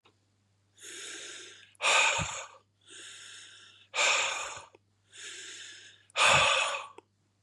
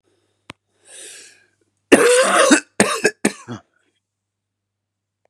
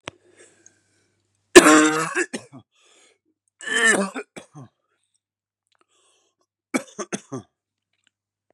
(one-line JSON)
{"exhalation_length": "7.4 s", "exhalation_amplitude": 9941, "exhalation_signal_mean_std_ratio": 0.45, "cough_length": "5.3 s", "cough_amplitude": 32768, "cough_signal_mean_std_ratio": 0.35, "three_cough_length": "8.5 s", "three_cough_amplitude": 32768, "three_cough_signal_mean_std_ratio": 0.25, "survey_phase": "beta (2021-08-13 to 2022-03-07)", "age": "18-44", "gender": "Male", "wearing_mask": "No", "symptom_cough_any": true, "symptom_runny_or_blocked_nose": true, "symptom_sore_throat": true, "symptom_fatigue": true, "symptom_fever_high_temperature": true, "symptom_headache": true, "symptom_change_to_sense_of_smell_or_taste": true, "symptom_other": true, "symptom_onset": "3 days", "smoker_status": "Never smoked", "respiratory_condition_asthma": false, "respiratory_condition_other": false, "recruitment_source": "Test and Trace", "submission_delay": "2 days", "covid_test_result": "Positive", "covid_test_method": "RT-qPCR", "covid_ct_value": 23.2, "covid_ct_gene": "ORF1ab gene"}